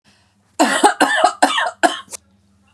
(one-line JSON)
{"cough_length": "2.7 s", "cough_amplitude": 32768, "cough_signal_mean_std_ratio": 0.49, "survey_phase": "beta (2021-08-13 to 2022-03-07)", "age": "45-64", "gender": "Female", "wearing_mask": "No", "symptom_none": true, "smoker_status": "Ex-smoker", "respiratory_condition_asthma": false, "respiratory_condition_other": false, "recruitment_source": "REACT", "submission_delay": "2 days", "covid_test_result": "Negative", "covid_test_method": "RT-qPCR", "influenza_a_test_result": "Negative", "influenza_b_test_result": "Negative"}